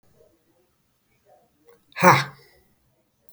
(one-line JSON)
{"exhalation_length": "3.3 s", "exhalation_amplitude": 32767, "exhalation_signal_mean_std_ratio": 0.21, "survey_phase": "alpha (2021-03-01 to 2021-08-12)", "age": "45-64", "gender": "Male", "wearing_mask": "No", "symptom_none": true, "smoker_status": "Current smoker (11 or more cigarettes per day)", "respiratory_condition_asthma": false, "respiratory_condition_other": false, "recruitment_source": "REACT", "submission_delay": "2 days", "covid_test_result": "Negative", "covid_test_method": "RT-qPCR"}